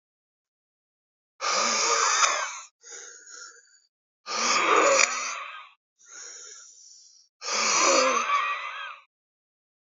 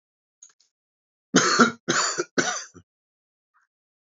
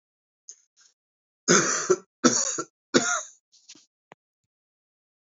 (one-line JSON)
{"exhalation_length": "10.0 s", "exhalation_amplitude": 22360, "exhalation_signal_mean_std_ratio": 0.52, "cough_length": "4.2 s", "cough_amplitude": 25250, "cough_signal_mean_std_ratio": 0.34, "three_cough_length": "5.2 s", "three_cough_amplitude": 22835, "three_cough_signal_mean_std_ratio": 0.33, "survey_phase": "alpha (2021-03-01 to 2021-08-12)", "age": "45-64", "gender": "Male", "wearing_mask": "No", "symptom_cough_any": true, "symptom_fatigue": true, "symptom_fever_high_temperature": true, "symptom_onset": "6 days", "smoker_status": "Never smoked", "respiratory_condition_asthma": false, "respiratory_condition_other": false, "recruitment_source": "Test and Trace", "submission_delay": "3 days", "covid_test_result": "Positive", "covid_test_method": "RT-qPCR"}